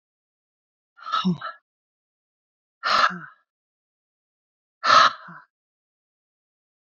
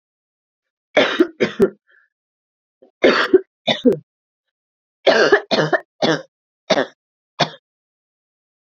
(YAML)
exhalation_length: 6.8 s
exhalation_amplitude: 22192
exhalation_signal_mean_std_ratio: 0.27
three_cough_length: 8.6 s
three_cough_amplitude: 29507
three_cough_signal_mean_std_ratio: 0.36
survey_phase: beta (2021-08-13 to 2022-03-07)
age: 45-64
gender: Female
wearing_mask: 'No'
symptom_cough_any: true
symptom_diarrhoea: true
symptom_fatigue: true
symptom_change_to_sense_of_smell_or_taste: true
symptom_loss_of_taste: true
symptom_other: true
symptom_onset: 7 days
smoker_status: Never smoked
respiratory_condition_asthma: false
respiratory_condition_other: false
recruitment_source: Test and Trace
submission_delay: 2 days
covid_test_result: Positive
covid_test_method: RT-qPCR